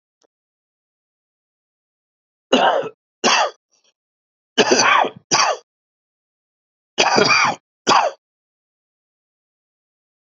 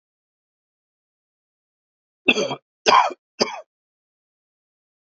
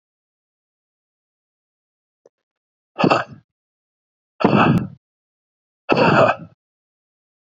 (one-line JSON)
{"three_cough_length": "10.3 s", "three_cough_amplitude": 30524, "three_cough_signal_mean_std_ratio": 0.37, "cough_length": "5.1 s", "cough_amplitude": 28403, "cough_signal_mean_std_ratio": 0.24, "exhalation_length": "7.5 s", "exhalation_amplitude": 28108, "exhalation_signal_mean_std_ratio": 0.31, "survey_phase": "beta (2021-08-13 to 2022-03-07)", "age": "45-64", "gender": "Male", "wearing_mask": "No", "symptom_cough_any": true, "symptom_runny_or_blocked_nose": true, "symptom_fever_high_temperature": true, "symptom_headache": true, "symptom_onset": "3 days", "smoker_status": "Never smoked", "respiratory_condition_asthma": false, "respiratory_condition_other": false, "recruitment_source": "Test and Trace", "submission_delay": "1 day", "covid_test_result": "Positive", "covid_test_method": "RT-qPCR"}